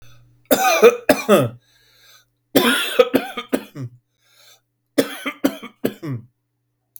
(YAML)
three_cough_length: 7.0 s
three_cough_amplitude: 32768
three_cough_signal_mean_std_ratio: 0.39
survey_phase: beta (2021-08-13 to 2022-03-07)
age: 45-64
gender: Male
wearing_mask: 'No'
symptom_fatigue: true
symptom_onset: 9 days
smoker_status: Ex-smoker
respiratory_condition_asthma: false
respiratory_condition_other: false
recruitment_source: REACT
submission_delay: 5 days
covid_test_result: Negative
covid_test_method: RT-qPCR
influenza_a_test_result: Negative
influenza_b_test_result: Negative